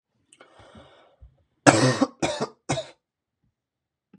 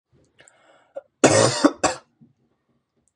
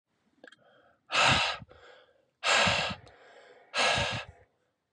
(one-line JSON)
{"three_cough_length": "4.2 s", "three_cough_amplitude": 32710, "three_cough_signal_mean_std_ratio": 0.29, "cough_length": "3.2 s", "cough_amplitude": 30679, "cough_signal_mean_std_ratio": 0.31, "exhalation_length": "4.9 s", "exhalation_amplitude": 8726, "exhalation_signal_mean_std_ratio": 0.46, "survey_phase": "beta (2021-08-13 to 2022-03-07)", "age": "18-44", "gender": "Male", "wearing_mask": "No", "symptom_sore_throat": true, "symptom_fatigue": true, "smoker_status": "Never smoked", "respiratory_condition_asthma": false, "respiratory_condition_other": false, "recruitment_source": "Test and Trace", "submission_delay": "1 day", "covid_test_result": "Positive", "covid_test_method": "RT-qPCR", "covid_ct_value": 25.6, "covid_ct_gene": "N gene"}